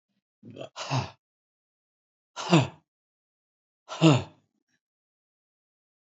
{"exhalation_length": "6.1 s", "exhalation_amplitude": 16583, "exhalation_signal_mean_std_ratio": 0.24, "survey_phase": "beta (2021-08-13 to 2022-03-07)", "age": "65+", "gender": "Male", "wearing_mask": "Yes", "symptom_runny_or_blocked_nose": true, "symptom_shortness_of_breath": true, "symptom_fatigue": true, "symptom_headache": true, "symptom_onset": "12 days", "smoker_status": "Ex-smoker", "respiratory_condition_asthma": true, "respiratory_condition_other": false, "recruitment_source": "REACT", "submission_delay": "1 day", "covid_test_result": "Negative", "covid_test_method": "RT-qPCR", "influenza_a_test_result": "Negative", "influenza_b_test_result": "Negative"}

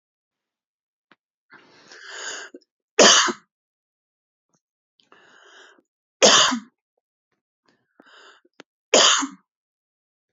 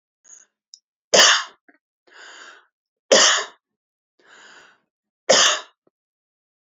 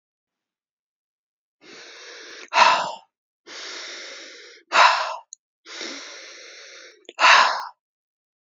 {"three_cough_length": "10.3 s", "three_cough_amplitude": 32076, "three_cough_signal_mean_std_ratio": 0.26, "cough_length": "6.7 s", "cough_amplitude": 28349, "cough_signal_mean_std_ratio": 0.3, "exhalation_length": "8.4 s", "exhalation_amplitude": 27205, "exhalation_signal_mean_std_ratio": 0.33, "survey_phase": "beta (2021-08-13 to 2022-03-07)", "age": "45-64", "gender": "Female", "wearing_mask": "No", "symptom_cough_any": true, "symptom_sore_throat": true, "symptom_abdominal_pain": true, "symptom_fatigue": true, "symptom_change_to_sense_of_smell_or_taste": true, "symptom_onset": "2 days", "smoker_status": "Never smoked", "respiratory_condition_asthma": false, "respiratory_condition_other": false, "recruitment_source": "Test and Trace", "submission_delay": "2 days", "covid_test_result": "Positive", "covid_test_method": "RT-qPCR", "covid_ct_value": 18.1, "covid_ct_gene": "ORF1ab gene", "covid_ct_mean": 18.3, "covid_viral_load": "980000 copies/ml", "covid_viral_load_category": "Low viral load (10K-1M copies/ml)"}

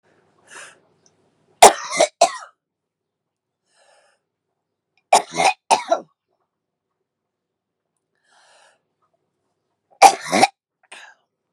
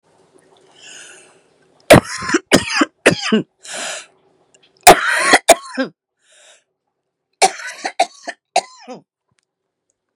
{"three_cough_length": "11.5 s", "three_cough_amplitude": 32768, "three_cough_signal_mean_std_ratio": 0.21, "cough_length": "10.2 s", "cough_amplitude": 32768, "cough_signal_mean_std_ratio": 0.31, "survey_phase": "beta (2021-08-13 to 2022-03-07)", "age": "18-44", "gender": "Female", "wearing_mask": "No", "symptom_cough_any": true, "symptom_new_continuous_cough": true, "symptom_runny_or_blocked_nose": true, "symptom_shortness_of_breath": true, "symptom_sore_throat": true, "symptom_abdominal_pain": true, "symptom_fatigue": true, "symptom_headache": true, "symptom_change_to_sense_of_smell_or_taste": true, "symptom_onset": "5 days", "smoker_status": "Current smoker (11 or more cigarettes per day)", "respiratory_condition_asthma": true, "respiratory_condition_other": false, "recruitment_source": "Test and Trace", "submission_delay": "2 days", "covid_test_result": "Positive", "covid_test_method": "RT-qPCR"}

